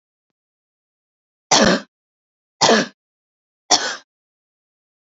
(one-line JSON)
{"three_cough_length": "5.1 s", "three_cough_amplitude": 32768, "three_cough_signal_mean_std_ratio": 0.29, "survey_phase": "alpha (2021-03-01 to 2021-08-12)", "age": "18-44", "gender": "Female", "wearing_mask": "No", "symptom_none": true, "symptom_onset": "8 days", "smoker_status": "Never smoked", "respiratory_condition_asthma": false, "respiratory_condition_other": false, "recruitment_source": "Test and Trace", "submission_delay": "2 days", "covid_test_result": "Positive", "covid_test_method": "RT-qPCR", "covid_ct_value": 26.5, "covid_ct_gene": "S gene", "covid_ct_mean": 26.9, "covid_viral_load": "1500 copies/ml", "covid_viral_load_category": "Minimal viral load (< 10K copies/ml)"}